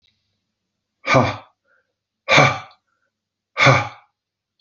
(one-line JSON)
{"exhalation_length": "4.6 s", "exhalation_amplitude": 32768, "exhalation_signal_mean_std_ratio": 0.32, "survey_phase": "beta (2021-08-13 to 2022-03-07)", "age": "45-64", "gender": "Male", "wearing_mask": "No", "symptom_none": true, "smoker_status": "Never smoked", "respiratory_condition_asthma": false, "respiratory_condition_other": false, "recruitment_source": "REACT", "submission_delay": "1 day", "covid_test_result": "Negative", "covid_test_method": "RT-qPCR", "influenza_a_test_result": "Negative", "influenza_b_test_result": "Negative"}